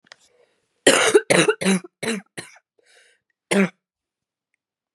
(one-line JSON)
{"cough_length": "4.9 s", "cough_amplitude": 32531, "cough_signal_mean_std_ratio": 0.35, "survey_phase": "beta (2021-08-13 to 2022-03-07)", "age": "18-44", "gender": "Female", "wearing_mask": "No", "symptom_cough_any": true, "symptom_runny_or_blocked_nose": true, "symptom_shortness_of_breath": true, "symptom_sore_throat": true, "symptom_abdominal_pain": true, "symptom_fatigue": true, "symptom_fever_high_temperature": true, "symptom_headache": true, "symptom_change_to_sense_of_smell_or_taste": true, "symptom_loss_of_taste": true, "symptom_other": true, "symptom_onset": "5 days", "smoker_status": "Ex-smoker", "respiratory_condition_asthma": false, "respiratory_condition_other": false, "recruitment_source": "Test and Trace", "submission_delay": "2 days", "covid_test_result": "Positive", "covid_test_method": "RT-qPCR", "covid_ct_value": 17.9, "covid_ct_gene": "ORF1ab gene", "covid_ct_mean": 18.2, "covid_viral_load": "1000000 copies/ml", "covid_viral_load_category": "High viral load (>1M copies/ml)"}